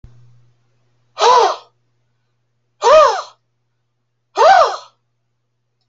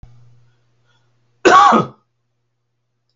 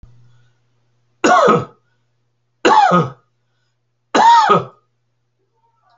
exhalation_length: 5.9 s
exhalation_amplitude: 28691
exhalation_signal_mean_std_ratio: 0.36
cough_length: 3.2 s
cough_amplitude: 29361
cough_signal_mean_std_ratio: 0.3
three_cough_length: 6.0 s
three_cough_amplitude: 32768
three_cough_signal_mean_std_ratio: 0.4
survey_phase: alpha (2021-03-01 to 2021-08-12)
age: 65+
gender: Male
wearing_mask: 'No'
symptom_none: true
smoker_status: Ex-smoker
respiratory_condition_asthma: false
respiratory_condition_other: false
recruitment_source: REACT
submission_delay: 1 day
covid_test_result: Negative
covid_test_method: RT-qPCR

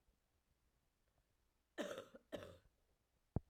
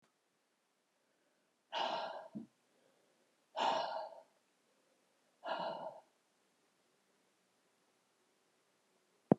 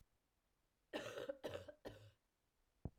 cough_length: 3.5 s
cough_amplitude: 1700
cough_signal_mean_std_ratio: 0.27
exhalation_length: 9.4 s
exhalation_amplitude: 9539
exhalation_signal_mean_std_ratio: 0.28
three_cough_length: 3.0 s
three_cough_amplitude: 885
three_cough_signal_mean_std_ratio: 0.43
survey_phase: beta (2021-08-13 to 2022-03-07)
age: 45-64
gender: Female
wearing_mask: 'No'
symptom_cough_any: true
symptom_runny_or_blocked_nose: true
symptom_abdominal_pain: true
symptom_fatigue: true
symptom_fever_high_temperature: true
symptom_headache: true
symptom_loss_of_taste: true
symptom_onset: 3 days
smoker_status: Never smoked
respiratory_condition_asthma: false
respiratory_condition_other: false
recruitment_source: Test and Trace
submission_delay: 1 day
covid_test_result: Positive
covid_test_method: RT-qPCR
covid_ct_value: 12.1
covid_ct_gene: ORF1ab gene
covid_ct_mean: 12.7
covid_viral_load: 66000000 copies/ml
covid_viral_load_category: High viral load (>1M copies/ml)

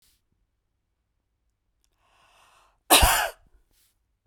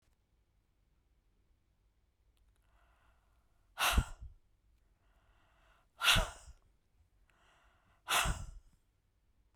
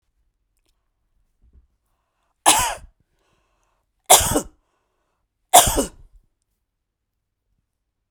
cough_length: 4.3 s
cough_amplitude: 31585
cough_signal_mean_std_ratio: 0.23
exhalation_length: 9.6 s
exhalation_amplitude: 6172
exhalation_signal_mean_std_ratio: 0.26
three_cough_length: 8.1 s
three_cough_amplitude: 32768
three_cough_signal_mean_std_ratio: 0.23
survey_phase: beta (2021-08-13 to 2022-03-07)
age: 45-64
gender: Female
wearing_mask: 'No'
symptom_none: true
smoker_status: Never smoked
respiratory_condition_asthma: false
respiratory_condition_other: false
recruitment_source: REACT
submission_delay: 1 day
covid_test_result: Negative
covid_test_method: RT-qPCR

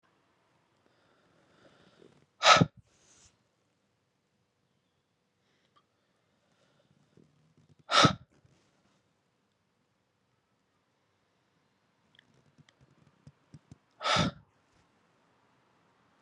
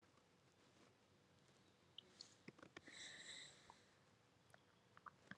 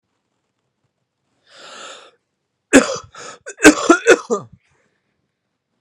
exhalation_length: 16.2 s
exhalation_amplitude: 17916
exhalation_signal_mean_std_ratio: 0.16
three_cough_length: 5.4 s
three_cough_amplitude: 359
three_cough_signal_mean_std_ratio: 0.6
cough_length: 5.8 s
cough_amplitude: 32768
cough_signal_mean_std_ratio: 0.26
survey_phase: beta (2021-08-13 to 2022-03-07)
age: 18-44
gender: Male
wearing_mask: 'No'
symptom_cough_any: true
symptom_runny_or_blocked_nose: true
symptom_diarrhoea: true
symptom_fatigue: true
symptom_headache: true
symptom_onset: 3 days
smoker_status: Never smoked
respiratory_condition_asthma: false
respiratory_condition_other: false
recruitment_source: Test and Trace
submission_delay: 2 days
covid_test_result: Positive
covid_test_method: RT-qPCR
covid_ct_value: 24.1
covid_ct_gene: N gene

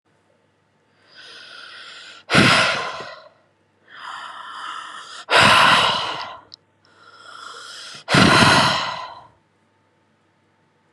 exhalation_length: 10.9 s
exhalation_amplitude: 31904
exhalation_signal_mean_std_ratio: 0.42
survey_phase: beta (2021-08-13 to 2022-03-07)
age: 18-44
gender: Female
wearing_mask: 'No'
symptom_fatigue: true
smoker_status: Never smoked
respiratory_condition_asthma: false
respiratory_condition_other: false
recruitment_source: REACT
submission_delay: 6 days
covid_test_result: Negative
covid_test_method: RT-qPCR
influenza_a_test_result: Negative
influenza_b_test_result: Negative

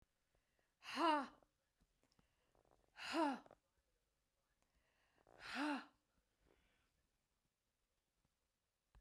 exhalation_length: 9.0 s
exhalation_amplitude: 1416
exhalation_signal_mean_std_ratio: 0.28
survey_phase: beta (2021-08-13 to 2022-03-07)
age: 65+
gender: Female
wearing_mask: 'No'
symptom_none: true
smoker_status: Ex-smoker
respiratory_condition_asthma: false
respiratory_condition_other: false
recruitment_source: REACT
submission_delay: 5 days
covid_test_result: Negative
covid_test_method: RT-qPCR
influenza_a_test_result: Negative
influenza_b_test_result: Negative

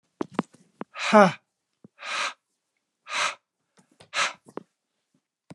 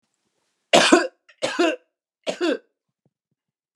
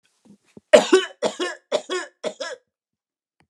exhalation_length: 5.5 s
exhalation_amplitude: 22802
exhalation_signal_mean_std_ratio: 0.27
three_cough_length: 3.8 s
three_cough_amplitude: 32752
three_cough_signal_mean_std_ratio: 0.35
cough_length: 3.5 s
cough_amplitude: 32767
cough_signal_mean_std_ratio: 0.31
survey_phase: alpha (2021-03-01 to 2021-08-12)
age: 65+
gender: Male
wearing_mask: 'No'
symptom_none: true
smoker_status: Never smoked
respiratory_condition_asthma: false
respiratory_condition_other: false
recruitment_source: REACT
submission_delay: 3 days
covid_test_result: Negative
covid_test_method: RT-qPCR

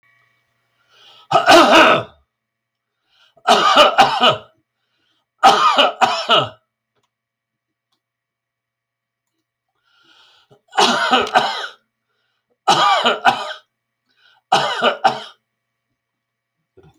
three_cough_length: 17.0 s
three_cough_amplitude: 32768
three_cough_signal_mean_std_ratio: 0.4
survey_phase: beta (2021-08-13 to 2022-03-07)
age: 65+
gender: Male
wearing_mask: 'No'
symptom_none: true
smoker_status: Ex-smoker
respiratory_condition_asthma: false
respiratory_condition_other: false
recruitment_source: REACT
submission_delay: 2 days
covid_test_result: Negative
covid_test_method: RT-qPCR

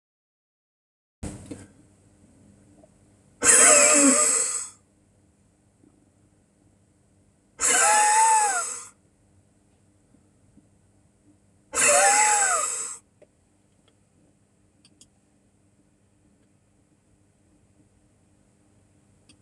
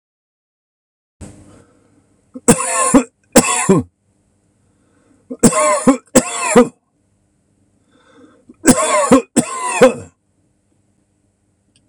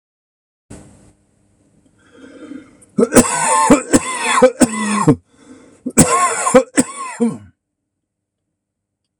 exhalation_length: 19.4 s
exhalation_amplitude: 23145
exhalation_signal_mean_std_ratio: 0.35
three_cough_length: 11.9 s
three_cough_amplitude: 26028
three_cough_signal_mean_std_ratio: 0.37
cough_length: 9.2 s
cough_amplitude: 26028
cough_signal_mean_std_ratio: 0.43
survey_phase: alpha (2021-03-01 to 2021-08-12)
age: 65+
gender: Male
wearing_mask: 'No'
symptom_none: true
smoker_status: Ex-smoker
respiratory_condition_asthma: false
respiratory_condition_other: true
recruitment_source: REACT
submission_delay: 1 day
covid_test_method: RT-qPCR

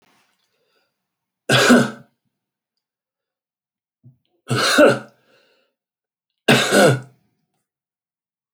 three_cough_length: 8.5 s
three_cough_amplitude: 28278
three_cough_signal_mean_std_ratio: 0.31
survey_phase: alpha (2021-03-01 to 2021-08-12)
age: 65+
gender: Male
wearing_mask: 'No'
symptom_none: true
smoker_status: Ex-smoker
respiratory_condition_asthma: false
respiratory_condition_other: false
recruitment_source: REACT
submission_delay: 2 days
covid_test_result: Negative
covid_test_method: RT-qPCR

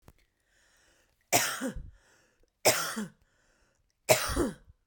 three_cough_length: 4.9 s
three_cough_amplitude: 16232
three_cough_signal_mean_std_ratio: 0.36
survey_phase: beta (2021-08-13 to 2022-03-07)
age: 18-44
gender: Female
wearing_mask: 'No'
symptom_none: true
smoker_status: Ex-smoker
respiratory_condition_asthma: false
respiratory_condition_other: false
recruitment_source: REACT
submission_delay: 1 day
covid_test_result: Negative
covid_test_method: RT-qPCR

